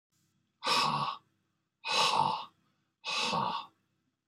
{"exhalation_length": "4.3 s", "exhalation_amplitude": 5835, "exhalation_signal_mean_std_ratio": 0.53, "survey_phase": "beta (2021-08-13 to 2022-03-07)", "age": "65+", "gender": "Male", "wearing_mask": "No", "symptom_none": true, "symptom_onset": "12 days", "smoker_status": "Never smoked", "respiratory_condition_asthma": true, "respiratory_condition_other": false, "recruitment_source": "REACT", "submission_delay": "2 days", "covid_test_result": "Negative", "covid_test_method": "RT-qPCR", "influenza_a_test_result": "Negative", "influenza_b_test_result": "Negative"}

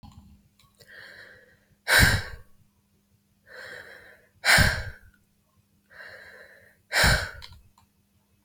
{"exhalation_length": "8.4 s", "exhalation_amplitude": 19330, "exhalation_signal_mean_std_ratio": 0.32, "survey_phase": "beta (2021-08-13 to 2022-03-07)", "age": "18-44", "gender": "Female", "wearing_mask": "No", "symptom_cough_any": true, "symptom_runny_or_blocked_nose": true, "symptom_loss_of_taste": true, "symptom_onset": "3 days", "smoker_status": "Never smoked", "respiratory_condition_asthma": false, "respiratory_condition_other": false, "recruitment_source": "Test and Trace", "submission_delay": "1 day", "covid_test_result": "Positive", "covid_test_method": "RT-qPCR", "covid_ct_value": 15.4, "covid_ct_gene": "ORF1ab gene", "covid_ct_mean": 15.7, "covid_viral_load": "7000000 copies/ml", "covid_viral_load_category": "High viral load (>1M copies/ml)"}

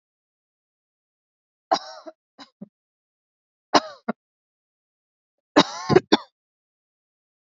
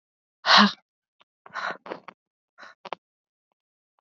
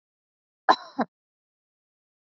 {"three_cough_length": "7.5 s", "three_cough_amplitude": 27933, "three_cough_signal_mean_std_ratio": 0.18, "exhalation_length": "4.2 s", "exhalation_amplitude": 23460, "exhalation_signal_mean_std_ratio": 0.23, "cough_length": "2.2 s", "cough_amplitude": 22000, "cough_signal_mean_std_ratio": 0.16, "survey_phase": "beta (2021-08-13 to 2022-03-07)", "age": "18-44", "gender": "Female", "wearing_mask": "No", "symptom_cough_any": true, "symptom_runny_or_blocked_nose": true, "symptom_sore_throat": true, "symptom_fatigue": true, "symptom_onset": "2 days", "smoker_status": "Current smoker (1 to 10 cigarettes per day)", "respiratory_condition_asthma": false, "respiratory_condition_other": false, "recruitment_source": "REACT", "submission_delay": "2 days", "covid_test_result": "Positive", "covid_test_method": "RT-qPCR", "covid_ct_value": 27.9, "covid_ct_gene": "E gene", "influenza_a_test_result": "Negative", "influenza_b_test_result": "Negative"}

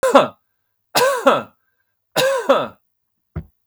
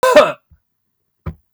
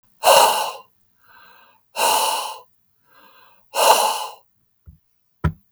{"three_cough_length": "3.7 s", "three_cough_amplitude": 32766, "three_cough_signal_mean_std_ratio": 0.45, "cough_length": "1.5 s", "cough_amplitude": 32768, "cough_signal_mean_std_ratio": 0.36, "exhalation_length": "5.7 s", "exhalation_amplitude": 32768, "exhalation_signal_mean_std_ratio": 0.41, "survey_phase": "beta (2021-08-13 to 2022-03-07)", "age": "45-64", "gender": "Male", "wearing_mask": "No", "symptom_none": true, "smoker_status": "Never smoked", "respiratory_condition_asthma": false, "respiratory_condition_other": false, "recruitment_source": "REACT", "submission_delay": "0 days", "covid_test_result": "Negative", "covid_test_method": "RT-qPCR", "influenza_a_test_result": "Negative", "influenza_b_test_result": "Negative"}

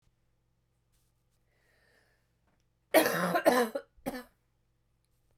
{"cough_length": "5.4 s", "cough_amplitude": 11931, "cough_signal_mean_std_ratio": 0.3, "survey_phase": "beta (2021-08-13 to 2022-03-07)", "age": "45-64", "gender": "Female", "wearing_mask": "No", "symptom_cough_any": true, "symptom_runny_or_blocked_nose": true, "symptom_change_to_sense_of_smell_or_taste": true, "smoker_status": "Never smoked", "respiratory_condition_asthma": false, "respiratory_condition_other": false, "recruitment_source": "Test and Trace", "submission_delay": "6 days", "covid_test_method": "PCR"}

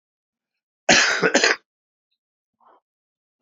{"cough_length": "3.4 s", "cough_amplitude": 31656, "cough_signal_mean_std_ratio": 0.32, "survey_phase": "alpha (2021-03-01 to 2021-08-12)", "age": "65+", "gender": "Male", "wearing_mask": "No", "symptom_abdominal_pain": true, "symptom_diarrhoea": true, "symptom_headache": true, "symptom_onset": "3 days", "smoker_status": "Never smoked", "respiratory_condition_asthma": false, "respiratory_condition_other": false, "recruitment_source": "Test and Trace", "submission_delay": "1 day", "covid_test_result": "Positive", "covid_test_method": "RT-qPCR", "covid_ct_value": 22.2, "covid_ct_gene": "ORF1ab gene", "covid_ct_mean": 22.6, "covid_viral_load": "39000 copies/ml", "covid_viral_load_category": "Low viral load (10K-1M copies/ml)"}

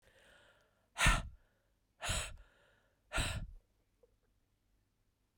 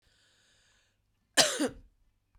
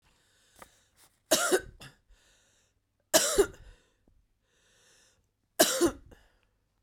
{"exhalation_length": "5.4 s", "exhalation_amplitude": 5728, "exhalation_signal_mean_std_ratio": 0.31, "cough_length": "2.4 s", "cough_amplitude": 16829, "cough_signal_mean_std_ratio": 0.26, "three_cough_length": "6.8 s", "three_cough_amplitude": 19360, "three_cough_signal_mean_std_ratio": 0.29, "survey_phase": "beta (2021-08-13 to 2022-03-07)", "age": "45-64", "gender": "Female", "wearing_mask": "No", "symptom_new_continuous_cough": true, "symptom_runny_or_blocked_nose": true, "symptom_shortness_of_breath": true, "symptom_fatigue": true, "symptom_headache": true, "symptom_change_to_sense_of_smell_or_taste": true, "symptom_loss_of_taste": true, "symptom_other": true, "symptom_onset": "3 days", "smoker_status": "Ex-smoker", "respiratory_condition_asthma": false, "respiratory_condition_other": false, "recruitment_source": "Test and Trace", "submission_delay": "2 days", "covid_test_result": "Positive", "covid_test_method": "RT-qPCR", "covid_ct_value": 22.2, "covid_ct_gene": "ORF1ab gene"}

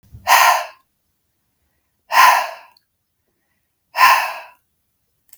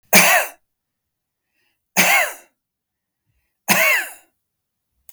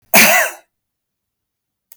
{"exhalation_length": "5.4 s", "exhalation_amplitude": 32768, "exhalation_signal_mean_std_ratio": 0.35, "three_cough_length": "5.1 s", "three_cough_amplitude": 32768, "three_cough_signal_mean_std_ratio": 0.36, "cough_length": "2.0 s", "cough_amplitude": 32768, "cough_signal_mean_std_ratio": 0.36, "survey_phase": "beta (2021-08-13 to 2022-03-07)", "age": "65+", "gender": "Male", "wearing_mask": "No", "symptom_none": true, "smoker_status": "Never smoked", "respiratory_condition_asthma": false, "respiratory_condition_other": false, "recruitment_source": "REACT", "submission_delay": "1 day", "covid_test_result": "Negative", "covid_test_method": "RT-qPCR", "influenza_a_test_result": "Negative", "influenza_b_test_result": "Negative"}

